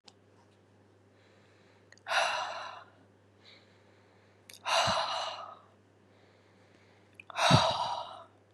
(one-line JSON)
{"exhalation_length": "8.5 s", "exhalation_amplitude": 13243, "exhalation_signal_mean_std_ratio": 0.39, "survey_phase": "beta (2021-08-13 to 2022-03-07)", "age": "18-44", "gender": "Female", "wearing_mask": "No", "symptom_cough_any": true, "symptom_new_continuous_cough": true, "symptom_runny_or_blocked_nose": true, "symptom_sore_throat": true, "symptom_fatigue": true, "symptom_headache": true, "symptom_loss_of_taste": true, "symptom_onset": "3 days", "smoker_status": "Never smoked", "respiratory_condition_asthma": false, "respiratory_condition_other": false, "recruitment_source": "Test and Trace", "submission_delay": "1 day", "covid_test_result": "Negative", "covid_test_method": "RT-qPCR"}